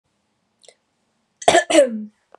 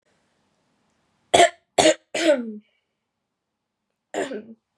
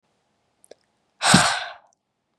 cough_length: 2.4 s
cough_amplitude: 32767
cough_signal_mean_std_ratio: 0.33
three_cough_length: 4.8 s
three_cough_amplitude: 30334
three_cough_signal_mean_std_ratio: 0.3
exhalation_length: 2.4 s
exhalation_amplitude: 31697
exhalation_signal_mean_std_ratio: 0.31
survey_phase: beta (2021-08-13 to 2022-03-07)
age: 18-44
gender: Female
wearing_mask: 'No'
symptom_runny_or_blocked_nose: true
smoker_status: Never smoked
respiratory_condition_asthma: false
respiratory_condition_other: false
recruitment_source: REACT
submission_delay: 3 days
covid_test_result: Negative
covid_test_method: RT-qPCR
influenza_a_test_result: Negative
influenza_b_test_result: Negative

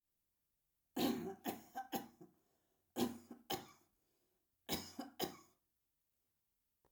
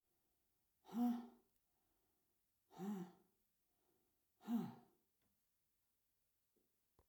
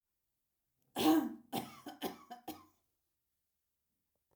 three_cough_length: 6.9 s
three_cough_amplitude: 1899
three_cough_signal_mean_std_ratio: 0.36
exhalation_length: 7.1 s
exhalation_amplitude: 877
exhalation_signal_mean_std_ratio: 0.29
cough_length: 4.4 s
cough_amplitude: 4430
cough_signal_mean_std_ratio: 0.3
survey_phase: alpha (2021-03-01 to 2021-08-12)
age: 65+
gender: Female
wearing_mask: 'No'
symptom_none: true
smoker_status: Ex-smoker
respiratory_condition_asthma: false
respiratory_condition_other: false
recruitment_source: REACT
submission_delay: 1 day
covid_test_result: Negative
covid_test_method: RT-qPCR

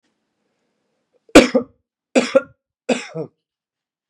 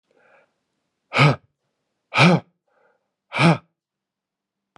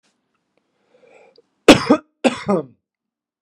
three_cough_length: 4.1 s
three_cough_amplitude: 32768
three_cough_signal_mean_std_ratio: 0.24
exhalation_length: 4.8 s
exhalation_amplitude: 28770
exhalation_signal_mean_std_ratio: 0.3
cough_length: 3.4 s
cough_amplitude: 32768
cough_signal_mean_std_ratio: 0.25
survey_phase: beta (2021-08-13 to 2022-03-07)
age: 45-64
gender: Male
wearing_mask: 'No'
symptom_cough_any: true
symptom_runny_or_blocked_nose: true
symptom_fatigue: true
symptom_headache: true
smoker_status: Never smoked
respiratory_condition_asthma: false
respiratory_condition_other: false
recruitment_source: Test and Trace
submission_delay: 2 days
covid_test_result: Positive
covid_test_method: RT-qPCR
covid_ct_value: 21.3
covid_ct_gene: ORF1ab gene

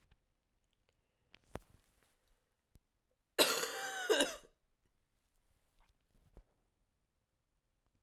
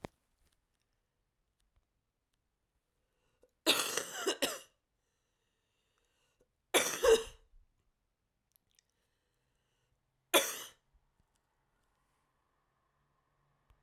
cough_length: 8.0 s
cough_amplitude: 6563
cough_signal_mean_std_ratio: 0.24
three_cough_length: 13.8 s
three_cough_amplitude: 8630
three_cough_signal_mean_std_ratio: 0.22
survey_phase: beta (2021-08-13 to 2022-03-07)
age: 18-44
gender: Female
wearing_mask: 'No'
symptom_cough_any: true
symptom_runny_or_blocked_nose: true
symptom_sore_throat: true
symptom_abdominal_pain: true
symptom_fatigue: true
symptom_fever_high_temperature: true
symptom_headache: true
symptom_change_to_sense_of_smell_or_taste: true
symptom_loss_of_taste: true
symptom_other: true
symptom_onset: 3 days
smoker_status: Never smoked
respiratory_condition_asthma: true
respiratory_condition_other: false
recruitment_source: Test and Trace
submission_delay: 1 day
covid_test_result: Positive
covid_test_method: RT-qPCR
covid_ct_value: 19.4
covid_ct_gene: ORF1ab gene
covid_ct_mean: 19.8
covid_viral_load: 310000 copies/ml
covid_viral_load_category: Low viral load (10K-1M copies/ml)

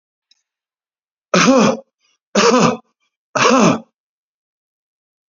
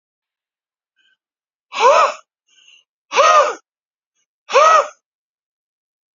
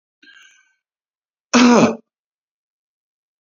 three_cough_length: 5.3 s
three_cough_amplitude: 30598
three_cough_signal_mean_std_ratio: 0.4
exhalation_length: 6.1 s
exhalation_amplitude: 32195
exhalation_signal_mean_std_ratio: 0.35
cough_length: 3.4 s
cough_amplitude: 31533
cough_signal_mean_std_ratio: 0.29
survey_phase: beta (2021-08-13 to 2022-03-07)
age: 45-64
gender: Male
wearing_mask: 'No'
symptom_none: true
smoker_status: Ex-smoker
respiratory_condition_asthma: false
respiratory_condition_other: false
recruitment_source: REACT
submission_delay: 3 days
covid_test_result: Negative
covid_test_method: RT-qPCR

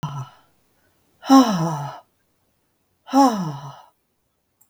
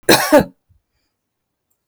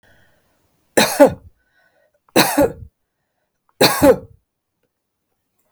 exhalation_length: 4.7 s
exhalation_amplitude: 31287
exhalation_signal_mean_std_ratio: 0.36
cough_length: 1.9 s
cough_amplitude: 32768
cough_signal_mean_std_ratio: 0.32
three_cough_length: 5.7 s
three_cough_amplitude: 32768
three_cough_signal_mean_std_ratio: 0.31
survey_phase: beta (2021-08-13 to 2022-03-07)
age: 65+
gender: Female
wearing_mask: 'No'
symptom_fatigue: true
symptom_onset: 12 days
smoker_status: Never smoked
respiratory_condition_asthma: false
respiratory_condition_other: false
recruitment_source: REACT
submission_delay: 2 days
covid_test_result: Negative
covid_test_method: RT-qPCR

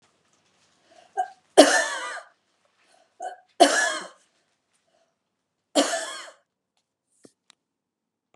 three_cough_length: 8.4 s
three_cough_amplitude: 32767
three_cough_signal_mean_std_ratio: 0.26
survey_phase: beta (2021-08-13 to 2022-03-07)
age: 65+
gender: Female
wearing_mask: 'No'
symptom_none: true
smoker_status: Never smoked
respiratory_condition_asthma: false
respiratory_condition_other: false
recruitment_source: REACT
submission_delay: 2 days
covid_test_result: Negative
covid_test_method: RT-qPCR
influenza_a_test_result: Negative
influenza_b_test_result: Negative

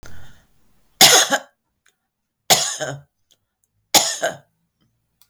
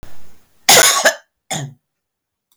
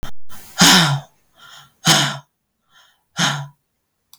three_cough_length: 5.3 s
three_cough_amplitude: 32768
three_cough_signal_mean_std_ratio: 0.33
cough_length: 2.6 s
cough_amplitude: 32768
cough_signal_mean_std_ratio: 0.43
exhalation_length: 4.2 s
exhalation_amplitude: 32766
exhalation_signal_mean_std_ratio: 0.46
survey_phase: beta (2021-08-13 to 2022-03-07)
age: 65+
gender: Female
wearing_mask: 'No'
symptom_none: true
smoker_status: Never smoked
respiratory_condition_asthma: false
respiratory_condition_other: false
recruitment_source: REACT
submission_delay: 3 days
covid_test_result: Negative
covid_test_method: RT-qPCR
influenza_a_test_result: Negative
influenza_b_test_result: Negative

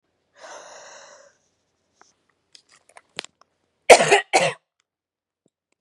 cough_length: 5.8 s
cough_amplitude: 32768
cough_signal_mean_std_ratio: 0.2
survey_phase: beta (2021-08-13 to 2022-03-07)
age: 18-44
gender: Female
wearing_mask: 'No'
symptom_cough_any: true
symptom_runny_or_blocked_nose: true
symptom_shortness_of_breath: true
symptom_sore_throat: true
symptom_fatigue: true
symptom_onset: 3 days
smoker_status: Never smoked
respiratory_condition_asthma: false
respiratory_condition_other: false
recruitment_source: Test and Trace
submission_delay: 2 days
covid_test_result: Positive
covid_test_method: RT-qPCR
covid_ct_value: 18.9
covid_ct_gene: ORF1ab gene
covid_ct_mean: 19.4
covid_viral_load: 440000 copies/ml
covid_viral_load_category: Low viral load (10K-1M copies/ml)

